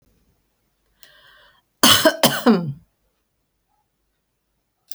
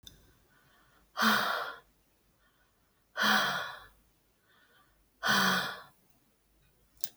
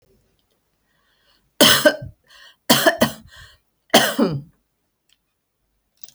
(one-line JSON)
{"cough_length": "4.9 s", "cough_amplitude": 32768, "cough_signal_mean_std_ratio": 0.28, "exhalation_length": "7.2 s", "exhalation_amplitude": 19214, "exhalation_signal_mean_std_ratio": 0.39, "three_cough_length": "6.1 s", "three_cough_amplitude": 32768, "three_cough_signal_mean_std_ratio": 0.32, "survey_phase": "alpha (2021-03-01 to 2021-08-12)", "age": "65+", "gender": "Female", "wearing_mask": "No", "symptom_none": true, "smoker_status": "Ex-smoker", "respiratory_condition_asthma": false, "respiratory_condition_other": false, "recruitment_source": "REACT", "submission_delay": "2 days", "covid_test_result": "Negative", "covid_test_method": "RT-qPCR"}